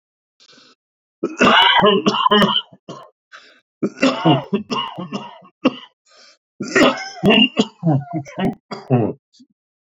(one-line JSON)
{"three_cough_length": "10.0 s", "three_cough_amplitude": 30272, "three_cough_signal_mean_std_ratio": 0.49, "survey_phase": "beta (2021-08-13 to 2022-03-07)", "age": "18-44", "gender": "Male", "wearing_mask": "No", "symptom_cough_any": true, "symptom_runny_or_blocked_nose": true, "symptom_fatigue": true, "symptom_headache": true, "smoker_status": "Current smoker (11 or more cigarettes per day)", "respiratory_condition_asthma": false, "respiratory_condition_other": false, "recruitment_source": "REACT", "submission_delay": "1 day", "covid_test_result": "Negative", "covid_test_method": "RT-qPCR", "influenza_a_test_result": "Negative", "influenza_b_test_result": "Negative"}